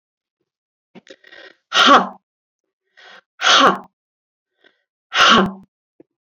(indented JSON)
{
  "exhalation_length": "6.2 s",
  "exhalation_amplitude": 32768,
  "exhalation_signal_mean_std_ratio": 0.33,
  "survey_phase": "beta (2021-08-13 to 2022-03-07)",
  "age": "45-64",
  "gender": "Female",
  "wearing_mask": "No",
  "symptom_none": true,
  "smoker_status": "Never smoked",
  "respiratory_condition_asthma": false,
  "respiratory_condition_other": false,
  "recruitment_source": "REACT",
  "submission_delay": "1 day",
  "covid_test_result": "Negative",
  "covid_test_method": "RT-qPCR"
}